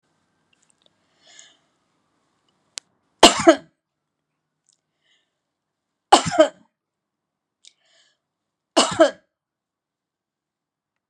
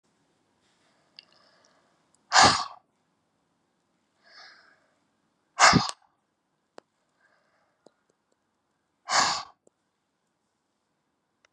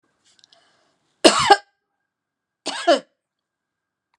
{"three_cough_length": "11.1 s", "three_cough_amplitude": 32768, "three_cough_signal_mean_std_ratio": 0.18, "exhalation_length": "11.5 s", "exhalation_amplitude": 25785, "exhalation_signal_mean_std_ratio": 0.21, "cough_length": "4.2 s", "cough_amplitude": 32768, "cough_signal_mean_std_ratio": 0.24, "survey_phase": "beta (2021-08-13 to 2022-03-07)", "age": "65+", "gender": "Female", "wearing_mask": "No", "symptom_none": true, "smoker_status": "Never smoked", "respiratory_condition_asthma": false, "respiratory_condition_other": false, "recruitment_source": "REACT", "submission_delay": "1 day", "covid_test_result": "Negative", "covid_test_method": "RT-qPCR"}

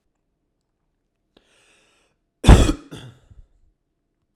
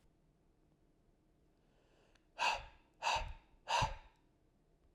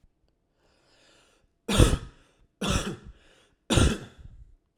{"cough_length": "4.4 s", "cough_amplitude": 32768, "cough_signal_mean_std_ratio": 0.19, "exhalation_length": "4.9 s", "exhalation_amplitude": 2751, "exhalation_signal_mean_std_ratio": 0.34, "three_cough_length": "4.8 s", "three_cough_amplitude": 20727, "three_cough_signal_mean_std_ratio": 0.33, "survey_phase": "alpha (2021-03-01 to 2021-08-12)", "age": "18-44", "gender": "Male", "wearing_mask": "No", "symptom_none": true, "smoker_status": "Current smoker (e-cigarettes or vapes only)", "respiratory_condition_asthma": false, "respiratory_condition_other": false, "recruitment_source": "REACT", "submission_delay": "3 days", "covid_test_result": "Negative", "covid_test_method": "RT-qPCR"}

